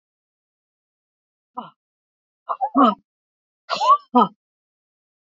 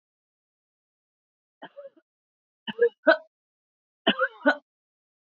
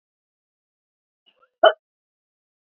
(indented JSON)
{
  "exhalation_length": "5.2 s",
  "exhalation_amplitude": 26618,
  "exhalation_signal_mean_std_ratio": 0.28,
  "three_cough_length": "5.4 s",
  "three_cough_amplitude": 18151,
  "three_cough_signal_mean_std_ratio": 0.23,
  "cough_length": "2.6 s",
  "cough_amplitude": 26746,
  "cough_signal_mean_std_ratio": 0.14,
  "survey_phase": "beta (2021-08-13 to 2022-03-07)",
  "age": "45-64",
  "gender": "Female",
  "wearing_mask": "No",
  "symptom_none": true,
  "smoker_status": "Never smoked",
  "respiratory_condition_asthma": false,
  "respiratory_condition_other": false,
  "recruitment_source": "Test and Trace",
  "submission_delay": "3 days",
  "covid_test_result": "Negative",
  "covid_test_method": "RT-qPCR"
}